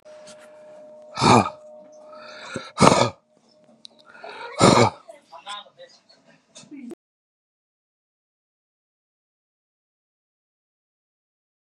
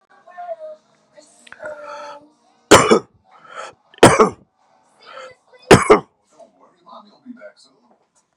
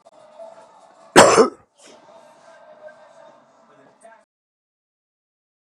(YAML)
exhalation_length: 11.8 s
exhalation_amplitude: 32768
exhalation_signal_mean_std_ratio: 0.25
three_cough_length: 8.4 s
three_cough_amplitude: 32768
three_cough_signal_mean_std_ratio: 0.26
cough_length: 5.7 s
cough_amplitude: 32768
cough_signal_mean_std_ratio: 0.21
survey_phase: beta (2021-08-13 to 2022-03-07)
age: 45-64
gender: Male
wearing_mask: 'No'
symptom_cough_any: true
symptom_new_continuous_cough: true
symptom_sore_throat: true
symptom_fatigue: true
symptom_onset: 2 days
smoker_status: Never smoked
respiratory_condition_asthma: false
respiratory_condition_other: false
recruitment_source: Test and Trace
submission_delay: 2 days
covid_test_result: Positive
covid_test_method: RT-qPCR
covid_ct_value: 25.6
covid_ct_gene: ORF1ab gene